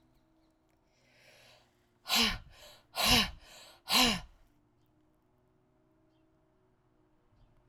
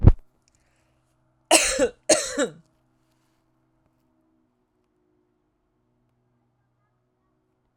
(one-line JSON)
{"exhalation_length": "7.7 s", "exhalation_amplitude": 8526, "exhalation_signal_mean_std_ratio": 0.29, "cough_length": "7.8 s", "cough_amplitude": 32768, "cough_signal_mean_std_ratio": 0.21, "survey_phase": "alpha (2021-03-01 to 2021-08-12)", "age": "45-64", "gender": "Female", "wearing_mask": "No", "symptom_none": true, "smoker_status": "Ex-smoker", "respiratory_condition_asthma": false, "respiratory_condition_other": false, "recruitment_source": "REACT", "submission_delay": "0 days", "covid_test_result": "Negative", "covid_test_method": "RT-qPCR"}